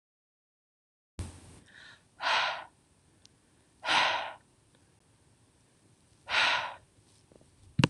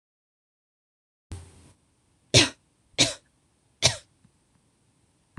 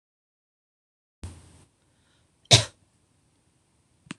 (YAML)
exhalation_length: 7.9 s
exhalation_amplitude: 13541
exhalation_signal_mean_std_ratio: 0.34
three_cough_length: 5.4 s
three_cough_amplitude: 25771
three_cough_signal_mean_std_ratio: 0.21
cough_length: 4.2 s
cough_amplitude: 26028
cough_signal_mean_std_ratio: 0.14
survey_phase: beta (2021-08-13 to 2022-03-07)
age: 18-44
gender: Female
wearing_mask: 'No'
symptom_runny_or_blocked_nose: true
symptom_shortness_of_breath: true
symptom_fatigue: true
smoker_status: Never smoked
respiratory_condition_asthma: false
respiratory_condition_other: false
recruitment_source: Test and Trace
submission_delay: 1 day
covid_test_result: Positive
covid_test_method: RT-qPCR
covid_ct_value: 34.3
covid_ct_gene: N gene